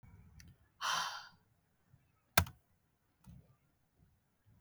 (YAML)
exhalation_length: 4.6 s
exhalation_amplitude: 12263
exhalation_signal_mean_std_ratio: 0.24
survey_phase: beta (2021-08-13 to 2022-03-07)
age: 18-44
gender: Female
wearing_mask: 'No'
symptom_cough_any: true
symptom_fatigue: true
smoker_status: Never smoked
respiratory_condition_asthma: false
respiratory_condition_other: false
recruitment_source: REACT
submission_delay: 3 days
covid_test_result: Negative
covid_test_method: RT-qPCR
influenza_a_test_result: Negative
influenza_b_test_result: Negative